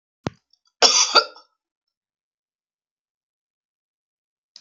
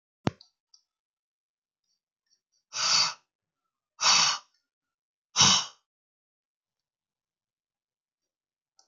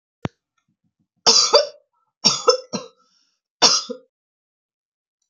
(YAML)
cough_length: 4.6 s
cough_amplitude: 32066
cough_signal_mean_std_ratio: 0.22
exhalation_length: 8.9 s
exhalation_amplitude: 15721
exhalation_signal_mean_std_ratio: 0.26
three_cough_length: 5.3 s
three_cough_amplitude: 32768
three_cough_signal_mean_std_ratio: 0.31
survey_phase: beta (2021-08-13 to 2022-03-07)
age: 65+
gender: Female
wearing_mask: 'No'
symptom_diarrhoea: true
smoker_status: Never smoked
respiratory_condition_asthma: false
respiratory_condition_other: false
recruitment_source: REACT
submission_delay: 1 day
covid_test_result: Negative
covid_test_method: RT-qPCR